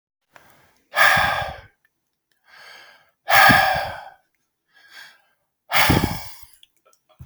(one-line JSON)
{"exhalation_length": "7.3 s", "exhalation_amplitude": 32767, "exhalation_signal_mean_std_ratio": 0.38, "survey_phase": "beta (2021-08-13 to 2022-03-07)", "age": "45-64", "gender": "Male", "wearing_mask": "No", "symptom_none": true, "smoker_status": "Never smoked", "respiratory_condition_asthma": false, "respiratory_condition_other": false, "recruitment_source": "REACT", "submission_delay": "2 days", "covid_test_result": "Negative", "covid_test_method": "RT-qPCR", "influenza_a_test_result": "Negative", "influenza_b_test_result": "Negative"}